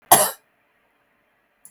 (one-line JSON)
{"cough_length": "1.7 s", "cough_amplitude": 32768, "cough_signal_mean_std_ratio": 0.23, "survey_phase": "beta (2021-08-13 to 2022-03-07)", "age": "65+", "gender": "Female", "wearing_mask": "No", "symptom_none": true, "smoker_status": "Ex-smoker", "respiratory_condition_asthma": false, "respiratory_condition_other": false, "recruitment_source": "REACT", "submission_delay": "1 day", "covid_test_result": "Negative", "covid_test_method": "RT-qPCR"}